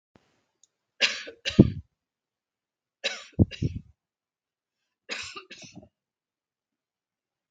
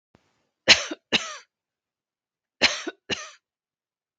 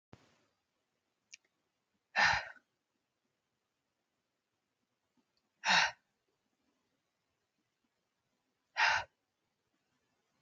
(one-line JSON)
{"three_cough_length": "7.5 s", "three_cough_amplitude": 32768, "three_cough_signal_mean_std_ratio": 0.2, "cough_length": "4.2 s", "cough_amplitude": 32768, "cough_signal_mean_std_ratio": 0.24, "exhalation_length": "10.4 s", "exhalation_amplitude": 5486, "exhalation_signal_mean_std_ratio": 0.22, "survey_phase": "beta (2021-08-13 to 2022-03-07)", "age": "45-64", "gender": "Female", "wearing_mask": "No", "symptom_runny_or_blocked_nose": true, "symptom_shortness_of_breath": true, "symptom_sore_throat": true, "smoker_status": "Never smoked", "respiratory_condition_asthma": false, "respiratory_condition_other": false, "recruitment_source": "REACT", "submission_delay": "4 days", "covid_test_result": "Negative", "covid_test_method": "RT-qPCR"}